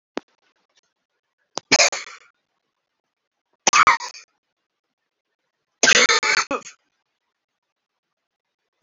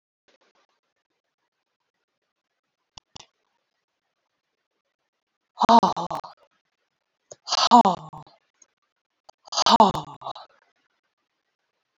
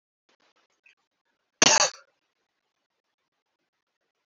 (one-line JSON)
{"three_cough_length": "8.8 s", "three_cough_amplitude": 31770, "three_cough_signal_mean_std_ratio": 0.27, "exhalation_length": "12.0 s", "exhalation_amplitude": 25585, "exhalation_signal_mean_std_ratio": 0.22, "cough_length": "4.3 s", "cough_amplitude": 27323, "cough_signal_mean_std_ratio": 0.18, "survey_phase": "beta (2021-08-13 to 2022-03-07)", "age": "45-64", "gender": "Female", "wearing_mask": "No", "symptom_new_continuous_cough": true, "symptom_runny_or_blocked_nose": true, "symptom_fatigue": true, "symptom_headache": true, "symptom_onset": "3 days", "smoker_status": "Ex-smoker", "respiratory_condition_asthma": false, "respiratory_condition_other": false, "recruitment_source": "Test and Trace", "submission_delay": "1 day", "covid_test_result": "Negative", "covid_test_method": "RT-qPCR"}